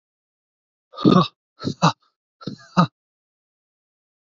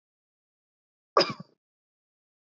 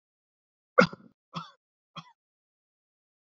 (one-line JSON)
{"exhalation_length": "4.4 s", "exhalation_amplitude": 28294, "exhalation_signal_mean_std_ratio": 0.26, "cough_length": "2.5 s", "cough_amplitude": 15006, "cough_signal_mean_std_ratio": 0.17, "three_cough_length": "3.2 s", "three_cough_amplitude": 23286, "three_cough_signal_mean_std_ratio": 0.14, "survey_phase": "beta (2021-08-13 to 2022-03-07)", "age": "18-44", "gender": "Male", "wearing_mask": "No", "symptom_runny_or_blocked_nose": true, "smoker_status": "Never smoked", "respiratory_condition_asthma": false, "respiratory_condition_other": false, "recruitment_source": "Test and Trace", "submission_delay": "2 days", "covid_test_result": "Positive", "covid_test_method": "RT-qPCR"}